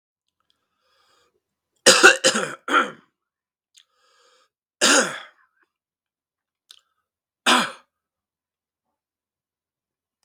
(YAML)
three_cough_length: 10.2 s
three_cough_amplitude: 32768
three_cough_signal_mean_std_ratio: 0.25
survey_phase: beta (2021-08-13 to 2022-03-07)
age: 45-64
gender: Male
wearing_mask: 'No'
symptom_cough_any: true
symptom_runny_or_blocked_nose: true
symptom_fatigue: true
symptom_fever_high_temperature: true
symptom_change_to_sense_of_smell_or_taste: true
symptom_loss_of_taste: true
symptom_onset: 4 days
smoker_status: Never smoked
respiratory_condition_asthma: false
respiratory_condition_other: false
recruitment_source: Test and Trace
submission_delay: 2 days
covid_test_result: Positive
covid_test_method: LAMP